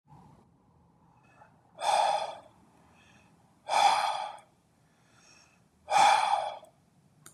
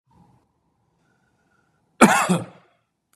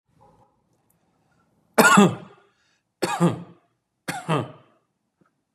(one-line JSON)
{"exhalation_length": "7.3 s", "exhalation_amplitude": 9617, "exhalation_signal_mean_std_ratio": 0.4, "cough_length": "3.2 s", "cough_amplitude": 32767, "cough_signal_mean_std_ratio": 0.25, "three_cough_length": "5.5 s", "three_cough_amplitude": 31872, "three_cough_signal_mean_std_ratio": 0.29, "survey_phase": "beta (2021-08-13 to 2022-03-07)", "age": "45-64", "gender": "Male", "wearing_mask": "No", "symptom_none": true, "smoker_status": "Ex-smoker", "respiratory_condition_asthma": true, "respiratory_condition_other": false, "recruitment_source": "REACT", "submission_delay": "1 day", "covid_test_result": "Negative", "covid_test_method": "RT-qPCR", "influenza_a_test_result": "Negative", "influenza_b_test_result": "Negative"}